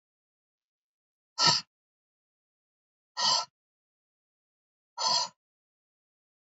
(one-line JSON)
{"exhalation_length": "6.5 s", "exhalation_amplitude": 11693, "exhalation_signal_mean_std_ratio": 0.26, "survey_phase": "beta (2021-08-13 to 2022-03-07)", "age": "18-44", "gender": "Female", "wearing_mask": "No", "symptom_none": true, "smoker_status": "Never smoked", "respiratory_condition_asthma": false, "respiratory_condition_other": false, "recruitment_source": "REACT", "submission_delay": "1 day", "covid_test_result": "Negative", "covid_test_method": "RT-qPCR", "influenza_a_test_result": "Negative", "influenza_b_test_result": "Negative"}